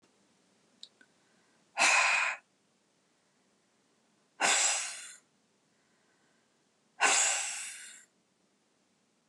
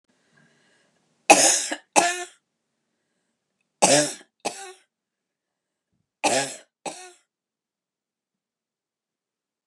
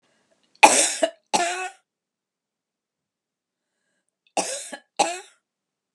{"exhalation_length": "9.3 s", "exhalation_amplitude": 8390, "exhalation_signal_mean_std_ratio": 0.36, "three_cough_length": "9.7 s", "three_cough_amplitude": 32733, "three_cough_signal_mean_std_ratio": 0.26, "cough_length": "5.9 s", "cough_amplitude": 32768, "cough_signal_mean_std_ratio": 0.28, "survey_phase": "beta (2021-08-13 to 2022-03-07)", "age": "65+", "gender": "Female", "wearing_mask": "No", "symptom_none": true, "symptom_onset": "5 days", "smoker_status": "Ex-smoker", "respiratory_condition_asthma": false, "respiratory_condition_other": false, "recruitment_source": "REACT", "submission_delay": "2 days", "covid_test_result": "Negative", "covid_test_method": "RT-qPCR", "influenza_a_test_result": "Negative", "influenza_b_test_result": "Negative"}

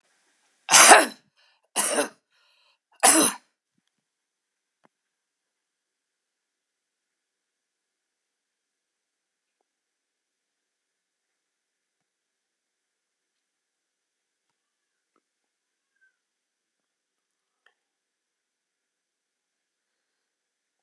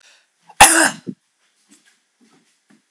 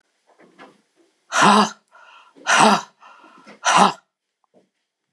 {"three_cough_length": "20.8 s", "three_cough_amplitude": 32767, "three_cough_signal_mean_std_ratio": 0.15, "cough_length": "2.9 s", "cough_amplitude": 32768, "cough_signal_mean_std_ratio": 0.25, "exhalation_length": "5.1 s", "exhalation_amplitude": 32118, "exhalation_signal_mean_std_ratio": 0.36, "survey_phase": "alpha (2021-03-01 to 2021-08-12)", "age": "65+", "gender": "Female", "wearing_mask": "No", "symptom_cough_any": true, "symptom_fatigue": true, "symptom_headache": true, "symptom_change_to_sense_of_smell_or_taste": true, "symptom_loss_of_taste": true, "smoker_status": "Never smoked", "respiratory_condition_asthma": false, "respiratory_condition_other": false, "recruitment_source": "Test and Trace", "submission_delay": "2 days", "covid_test_result": "Positive", "covid_test_method": "RT-qPCR", "covid_ct_value": 17.4, "covid_ct_gene": "ORF1ab gene"}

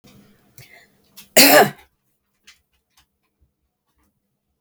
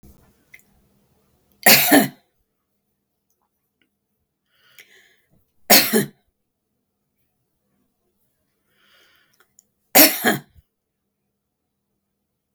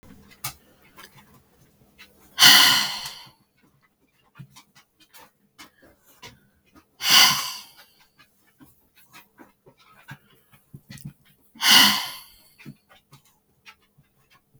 {"cough_length": "4.6 s", "cough_amplitude": 32768, "cough_signal_mean_std_ratio": 0.22, "three_cough_length": "12.5 s", "three_cough_amplitude": 32768, "three_cough_signal_mean_std_ratio": 0.22, "exhalation_length": "14.6 s", "exhalation_amplitude": 32768, "exhalation_signal_mean_std_ratio": 0.26, "survey_phase": "beta (2021-08-13 to 2022-03-07)", "age": "65+", "gender": "Female", "wearing_mask": "No", "symptom_none": true, "smoker_status": "Ex-smoker", "respiratory_condition_asthma": false, "respiratory_condition_other": false, "recruitment_source": "REACT", "submission_delay": "8 days", "covid_test_result": "Negative", "covid_test_method": "RT-qPCR", "influenza_a_test_result": "Negative", "influenza_b_test_result": "Negative"}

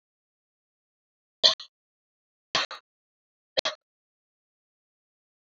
{"three_cough_length": "5.5 s", "three_cough_amplitude": 21130, "three_cough_signal_mean_std_ratio": 0.16, "survey_phase": "beta (2021-08-13 to 2022-03-07)", "age": "45-64", "gender": "Female", "wearing_mask": "No", "symptom_fatigue": true, "smoker_status": "Never smoked", "respiratory_condition_asthma": false, "respiratory_condition_other": false, "recruitment_source": "REACT", "submission_delay": "1 day", "covid_test_result": "Negative", "covid_test_method": "RT-qPCR", "influenza_a_test_result": "Negative", "influenza_b_test_result": "Negative"}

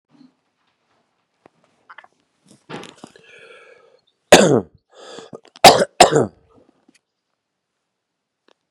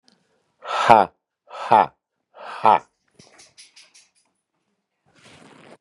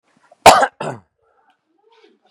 {"three_cough_length": "8.7 s", "three_cough_amplitude": 32768, "three_cough_signal_mean_std_ratio": 0.21, "exhalation_length": "5.8 s", "exhalation_amplitude": 32768, "exhalation_signal_mean_std_ratio": 0.25, "cough_length": "2.3 s", "cough_amplitude": 32768, "cough_signal_mean_std_ratio": 0.25, "survey_phase": "beta (2021-08-13 to 2022-03-07)", "age": "45-64", "gender": "Male", "wearing_mask": "No", "symptom_cough_any": true, "symptom_runny_or_blocked_nose": true, "symptom_fever_high_temperature": true, "symptom_headache": true, "symptom_onset": "2 days", "smoker_status": "Never smoked", "respiratory_condition_asthma": false, "respiratory_condition_other": false, "recruitment_source": "Test and Trace", "submission_delay": "0 days", "covid_test_result": "Positive", "covid_test_method": "RT-qPCR", "covid_ct_value": 16.3, "covid_ct_gene": "ORF1ab gene"}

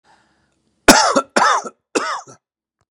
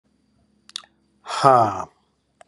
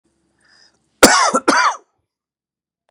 {"three_cough_length": "2.9 s", "three_cough_amplitude": 32768, "three_cough_signal_mean_std_ratio": 0.39, "exhalation_length": "2.5 s", "exhalation_amplitude": 32103, "exhalation_signal_mean_std_ratio": 0.31, "cough_length": "2.9 s", "cough_amplitude": 32768, "cough_signal_mean_std_ratio": 0.35, "survey_phase": "beta (2021-08-13 to 2022-03-07)", "age": "45-64", "gender": "Male", "wearing_mask": "No", "symptom_cough_any": true, "symptom_runny_or_blocked_nose": true, "symptom_headache": true, "symptom_change_to_sense_of_smell_or_taste": true, "symptom_loss_of_taste": true, "symptom_other": true, "symptom_onset": "3 days", "smoker_status": "Ex-smoker", "respiratory_condition_asthma": false, "respiratory_condition_other": false, "recruitment_source": "Test and Trace", "submission_delay": "2 days", "covid_test_result": "Positive", "covid_test_method": "RT-qPCR", "covid_ct_value": 22.9, "covid_ct_gene": "ORF1ab gene"}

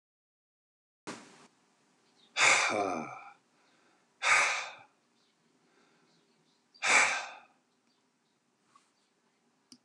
{"exhalation_length": "9.8 s", "exhalation_amplitude": 10032, "exhalation_signal_mean_std_ratio": 0.32, "survey_phase": "alpha (2021-03-01 to 2021-08-12)", "age": "65+", "gender": "Male", "wearing_mask": "No", "symptom_none": true, "smoker_status": "Ex-smoker", "respiratory_condition_asthma": false, "respiratory_condition_other": false, "recruitment_source": "REACT", "submission_delay": "1 day", "covid_test_result": "Negative", "covid_test_method": "RT-qPCR"}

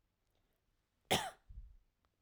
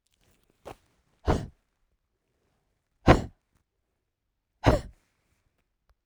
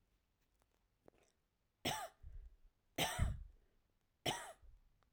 {"cough_length": "2.2 s", "cough_amplitude": 3985, "cough_signal_mean_std_ratio": 0.25, "exhalation_length": "6.1 s", "exhalation_amplitude": 25268, "exhalation_signal_mean_std_ratio": 0.19, "three_cough_length": "5.1 s", "three_cough_amplitude": 2148, "three_cough_signal_mean_std_ratio": 0.35, "survey_phase": "alpha (2021-03-01 to 2021-08-12)", "age": "45-64", "gender": "Female", "wearing_mask": "No", "symptom_none": true, "smoker_status": "Ex-smoker", "respiratory_condition_asthma": false, "respiratory_condition_other": false, "recruitment_source": "REACT", "submission_delay": "2 days", "covid_test_result": "Negative", "covid_test_method": "RT-qPCR"}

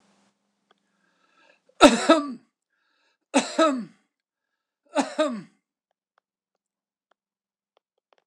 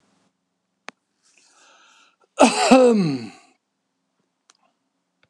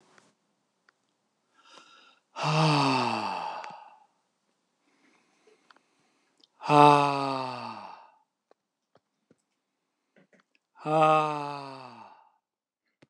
{"three_cough_length": "8.3 s", "three_cough_amplitude": 26028, "three_cough_signal_mean_std_ratio": 0.24, "cough_length": "5.3 s", "cough_amplitude": 26028, "cough_signal_mean_std_ratio": 0.3, "exhalation_length": "13.1 s", "exhalation_amplitude": 22962, "exhalation_signal_mean_std_ratio": 0.32, "survey_phase": "beta (2021-08-13 to 2022-03-07)", "age": "65+", "gender": "Male", "wearing_mask": "No", "symptom_none": true, "symptom_onset": "12 days", "smoker_status": "Never smoked", "respiratory_condition_asthma": false, "respiratory_condition_other": false, "recruitment_source": "REACT", "submission_delay": "2 days", "covid_test_result": "Negative", "covid_test_method": "RT-qPCR"}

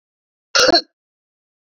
{"cough_length": "1.8 s", "cough_amplitude": 32768, "cough_signal_mean_std_ratio": 0.3, "survey_phase": "beta (2021-08-13 to 2022-03-07)", "age": "65+", "gender": "Female", "wearing_mask": "No", "symptom_none": true, "smoker_status": "Current smoker (11 or more cigarettes per day)", "respiratory_condition_asthma": false, "respiratory_condition_other": false, "recruitment_source": "REACT", "submission_delay": "0 days", "covid_test_result": "Negative", "covid_test_method": "RT-qPCR", "influenza_a_test_result": "Negative", "influenza_b_test_result": "Negative"}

